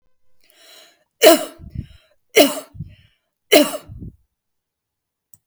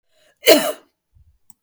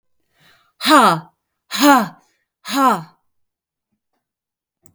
{"three_cough_length": "5.5 s", "three_cough_amplitude": 32768, "three_cough_signal_mean_std_ratio": 0.27, "cough_length": "1.6 s", "cough_amplitude": 32768, "cough_signal_mean_std_ratio": 0.29, "exhalation_length": "4.9 s", "exhalation_amplitude": 32768, "exhalation_signal_mean_std_ratio": 0.35, "survey_phase": "beta (2021-08-13 to 2022-03-07)", "age": "45-64", "gender": "Female", "wearing_mask": "No", "symptom_none": true, "smoker_status": "Never smoked", "respiratory_condition_asthma": false, "respiratory_condition_other": false, "recruitment_source": "REACT", "submission_delay": "8 days", "covid_test_result": "Negative", "covid_test_method": "RT-qPCR", "influenza_a_test_result": "Negative", "influenza_b_test_result": "Negative"}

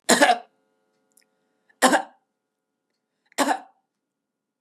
{"three_cough_length": "4.6 s", "three_cough_amplitude": 29758, "three_cough_signal_mean_std_ratio": 0.28, "survey_phase": "beta (2021-08-13 to 2022-03-07)", "age": "65+", "gender": "Female", "wearing_mask": "No", "symptom_abdominal_pain": true, "smoker_status": "Never smoked", "respiratory_condition_asthma": false, "respiratory_condition_other": false, "recruitment_source": "REACT", "submission_delay": "5 days", "covid_test_result": "Negative", "covid_test_method": "RT-qPCR", "influenza_a_test_result": "Negative", "influenza_b_test_result": "Negative"}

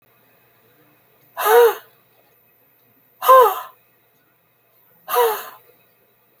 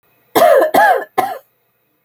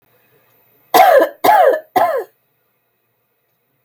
{"exhalation_length": "6.4 s", "exhalation_amplitude": 28806, "exhalation_signal_mean_std_ratio": 0.31, "cough_length": "2.0 s", "cough_amplitude": 32768, "cough_signal_mean_std_ratio": 0.54, "three_cough_length": "3.8 s", "three_cough_amplitude": 30919, "three_cough_signal_mean_std_ratio": 0.43, "survey_phase": "alpha (2021-03-01 to 2021-08-12)", "age": "65+", "gender": "Female", "wearing_mask": "No", "symptom_none": true, "smoker_status": "Never smoked", "respiratory_condition_asthma": false, "respiratory_condition_other": false, "recruitment_source": "REACT", "submission_delay": "2 days", "covid_test_result": "Negative", "covid_test_method": "RT-qPCR"}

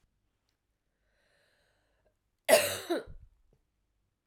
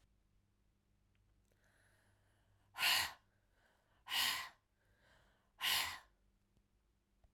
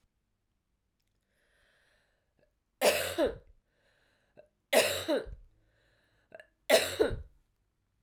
{"cough_length": "4.3 s", "cough_amplitude": 12992, "cough_signal_mean_std_ratio": 0.22, "exhalation_length": "7.3 s", "exhalation_amplitude": 2507, "exhalation_signal_mean_std_ratio": 0.31, "three_cough_length": "8.0 s", "three_cough_amplitude": 10706, "three_cough_signal_mean_std_ratio": 0.31, "survey_phase": "beta (2021-08-13 to 2022-03-07)", "age": "65+", "gender": "Female", "wearing_mask": "No", "symptom_cough_any": true, "symptom_runny_or_blocked_nose": true, "symptom_headache": true, "symptom_change_to_sense_of_smell_or_taste": true, "smoker_status": "Never smoked", "respiratory_condition_asthma": false, "respiratory_condition_other": false, "recruitment_source": "Test and Trace", "submission_delay": "1 day", "covid_test_result": "Positive", "covid_test_method": "RT-qPCR", "covid_ct_value": 18.5, "covid_ct_gene": "ORF1ab gene", "covid_ct_mean": 19.4, "covid_viral_load": "430000 copies/ml", "covid_viral_load_category": "Low viral load (10K-1M copies/ml)"}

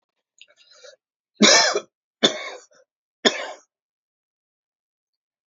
{"three_cough_length": "5.5 s", "three_cough_amplitude": 28255, "three_cough_signal_mean_std_ratio": 0.26, "survey_phase": "alpha (2021-03-01 to 2021-08-12)", "age": "65+", "gender": "Male", "wearing_mask": "No", "symptom_cough_any": true, "smoker_status": "Ex-smoker", "respiratory_condition_asthma": false, "respiratory_condition_other": false, "recruitment_source": "REACT", "submission_delay": "2 days", "covid_test_result": "Negative", "covid_test_method": "RT-qPCR"}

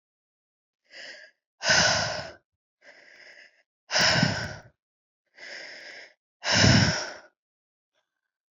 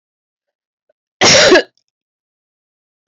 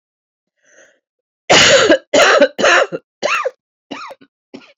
{"exhalation_length": "8.5 s", "exhalation_amplitude": 19342, "exhalation_signal_mean_std_ratio": 0.38, "cough_length": "3.1 s", "cough_amplitude": 32768, "cough_signal_mean_std_ratio": 0.32, "three_cough_length": "4.8 s", "three_cough_amplitude": 30757, "three_cough_signal_mean_std_ratio": 0.46, "survey_phase": "beta (2021-08-13 to 2022-03-07)", "age": "45-64", "gender": "Female", "wearing_mask": "No", "symptom_cough_any": true, "symptom_runny_or_blocked_nose": true, "symptom_shortness_of_breath": true, "symptom_sore_throat": true, "symptom_fatigue": true, "symptom_headache": true, "symptom_change_to_sense_of_smell_or_taste": true, "symptom_loss_of_taste": true, "symptom_onset": "3 days", "smoker_status": "Ex-smoker", "respiratory_condition_asthma": false, "respiratory_condition_other": false, "recruitment_source": "Test and Trace", "submission_delay": "2 days", "covid_test_result": "Positive", "covid_test_method": "RT-qPCR", "covid_ct_value": 27.5, "covid_ct_gene": "ORF1ab gene", "covid_ct_mean": 28.1, "covid_viral_load": "620 copies/ml", "covid_viral_load_category": "Minimal viral load (< 10K copies/ml)"}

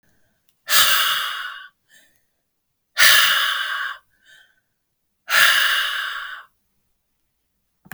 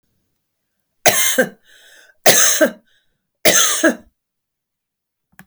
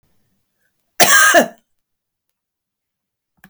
{"exhalation_length": "7.9 s", "exhalation_amplitude": 32768, "exhalation_signal_mean_std_ratio": 0.44, "three_cough_length": "5.5 s", "three_cough_amplitude": 32768, "three_cough_signal_mean_std_ratio": 0.38, "cough_length": "3.5 s", "cough_amplitude": 32768, "cough_signal_mean_std_ratio": 0.3, "survey_phase": "beta (2021-08-13 to 2022-03-07)", "age": "45-64", "gender": "Female", "wearing_mask": "No", "symptom_cough_any": true, "symptom_onset": "13 days", "smoker_status": "Never smoked", "respiratory_condition_asthma": false, "respiratory_condition_other": false, "recruitment_source": "REACT", "submission_delay": "0 days", "covid_test_result": "Negative", "covid_test_method": "RT-qPCR"}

